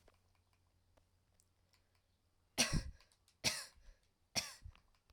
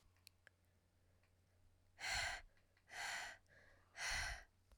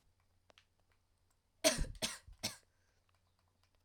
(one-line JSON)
{"three_cough_length": "5.1 s", "three_cough_amplitude": 3763, "three_cough_signal_mean_std_ratio": 0.27, "exhalation_length": "4.8 s", "exhalation_amplitude": 1044, "exhalation_signal_mean_std_ratio": 0.47, "cough_length": "3.8 s", "cough_amplitude": 5179, "cough_signal_mean_std_ratio": 0.25, "survey_phase": "alpha (2021-03-01 to 2021-08-12)", "age": "18-44", "gender": "Female", "wearing_mask": "No", "symptom_new_continuous_cough": true, "symptom_abdominal_pain": true, "symptom_fatigue": true, "symptom_fever_high_temperature": true, "symptom_headache": true, "symptom_onset": "3 days", "smoker_status": "Never smoked", "recruitment_source": "Test and Trace", "submission_delay": "1 day", "covid_test_result": "Positive", "covid_test_method": "RT-qPCR", "covid_ct_value": 15.4, "covid_ct_gene": "ORF1ab gene", "covid_ct_mean": 16.8, "covid_viral_load": "3200000 copies/ml", "covid_viral_load_category": "High viral load (>1M copies/ml)"}